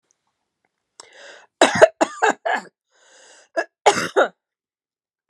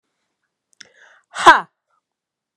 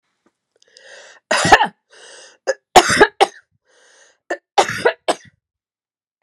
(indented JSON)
{
  "cough_length": "5.3 s",
  "cough_amplitude": 32768,
  "cough_signal_mean_std_ratio": 0.29,
  "exhalation_length": "2.6 s",
  "exhalation_amplitude": 32768,
  "exhalation_signal_mean_std_ratio": 0.19,
  "three_cough_length": "6.2 s",
  "three_cough_amplitude": 32768,
  "three_cough_signal_mean_std_ratio": 0.3,
  "survey_phase": "beta (2021-08-13 to 2022-03-07)",
  "age": "45-64",
  "gender": "Female",
  "wearing_mask": "No",
  "symptom_runny_or_blocked_nose": true,
  "symptom_change_to_sense_of_smell_or_taste": true,
  "symptom_loss_of_taste": true,
  "symptom_onset": "6 days",
  "smoker_status": "Ex-smoker",
  "respiratory_condition_asthma": false,
  "respiratory_condition_other": true,
  "recruitment_source": "Test and Trace",
  "submission_delay": "2 days",
  "covid_test_result": "Positive",
  "covid_test_method": "RT-qPCR",
  "covid_ct_value": 13.9,
  "covid_ct_gene": "ORF1ab gene",
  "covid_ct_mean": 14.2,
  "covid_viral_load": "21000000 copies/ml",
  "covid_viral_load_category": "High viral load (>1M copies/ml)"
}